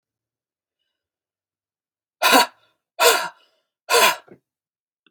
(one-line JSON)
{"exhalation_length": "5.1 s", "exhalation_amplitude": 32315, "exhalation_signal_mean_std_ratio": 0.3, "survey_phase": "beta (2021-08-13 to 2022-03-07)", "age": "45-64", "gender": "Female", "wearing_mask": "No", "symptom_cough_any": true, "symptom_new_continuous_cough": true, "symptom_sore_throat": true, "symptom_fever_high_temperature": true, "symptom_headache": true, "symptom_onset": "2 days", "smoker_status": "Never smoked", "respiratory_condition_asthma": false, "respiratory_condition_other": false, "recruitment_source": "Test and Trace", "submission_delay": "1 day", "covid_test_result": "Positive", "covid_test_method": "RT-qPCR", "covid_ct_value": 27.0, "covid_ct_gene": "N gene", "covid_ct_mean": 27.0, "covid_viral_load": "1300 copies/ml", "covid_viral_load_category": "Minimal viral load (< 10K copies/ml)"}